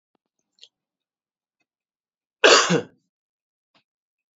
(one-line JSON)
{"cough_length": "4.4 s", "cough_amplitude": 29903, "cough_signal_mean_std_ratio": 0.21, "survey_phase": "beta (2021-08-13 to 2022-03-07)", "age": "45-64", "gender": "Male", "wearing_mask": "No", "symptom_cough_any": true, "symptom_runny_or_blocked_nose": true, "symptom_fatigue": true, "symptom_headache": true, "symptom_other": true, "symptom_onset": "2 days", "smoker_status": "Never smoked", "respiratory_condition_asthma": false, "respiratory_condition_other": false, "recruitment_source": "Test and Trace", "submission_delay": "0 days", "covid_test_result": "Positive", "covid_test_method": "ePCR"}